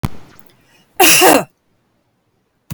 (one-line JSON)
{"cough_length": "2.7 s", "cough_amplitude": 32768, "cough_signal_mean_std_ratio": 0.37, "survey_phase": "beta (2021-08-13 to 2022-03-07)", "age": "65+", "gender": "Female", "wearing_mask": "No", "symptom_none": true, "smoker_status": "Ex-smoker", "respiratory_condition_asthma": false, "respiratory_condition_other": false, "recruitment_source": "REACT", "submission_delay": "2 days", "covid_test_result": "Negative", "covid_test_method": "RT-qPCR"}